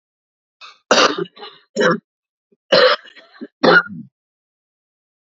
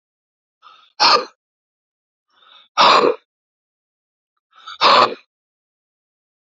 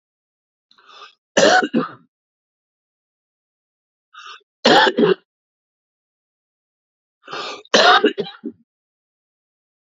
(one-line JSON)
{"cough_length": "5.4 s", "cough_amplitude": 32767, "cough_signal_mean_std_ratio": 0.35, "exhalation_length": "6.6 s", "exhalation_amplitude": 32768, "exhalation_signal_mean_std_ratio": 0.3, "three_cough_length": "9.9 s", "three_cough_amplitude": 31632, "three_cough_signal_mean_std_ratio": 0.3, "survey_phase": "beta (2021-08-13 to 2022-03-07)", "age": "45-64", "gender": "Male", "wearing_mask": "No", "symptom_new_continuous_cough": true, "symptom_fatigue": true, "smoker_status": "Ex-smoker", "respiratory_condition_asthma": false, "respiratory_condition_other": true, "recruitment_source": "REACT", "submission_delay": "0 days", "covid_test_result": "Negative", "covid_test_method": "RT-qPCR", "influenza_a_test_result": "Negative", "influenza_b_test_result": "Negative"}